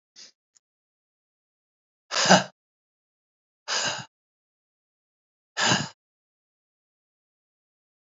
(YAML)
exhalation_length: 8.0 s
exhalation_amplitude: 29015
exhalation_signal_mean_std_ratio: 0.23
survey_phase: beta (2021-08-13 to 2022-03-07)
age: 45-64
gender: Male
wearing_mask: 'No'
symptom_none: true
smoker_status: Never smoked
respiratory_condition_asthma: false
respiratory_condition_other: false
recruitment_source: REACT
submission_delay: 2 days
covid_test_result: Negative
covid_test_method: RT-qPCR
influenza_a_test_result: Negative
influenza_b_test_result: Negative